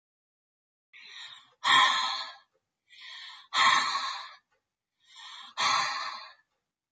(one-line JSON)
{"exhalation_length": "6.9 s", "exhalation_amplitude": 10230, "exhalation_signal_mean_std_ratio": 0.42, "survey_phase": "beta (2021-08-13 to 2022-03-07)", "age": "65+", "gender": "Female", "wearing_mask": "No", "symptom_none": true, "smoker_status": "Ex-smoker", "respiratory_condition_asthma": true, "respiratory_condition_other": false, "recruitment_source": "REACT", "submission_delay": "2 days", "covid_test_result": "Negative", "covid_test_method": "RT-qPCR", "influenza_a_test_result": "Negative", "influenza_b_test_result": "Negative"}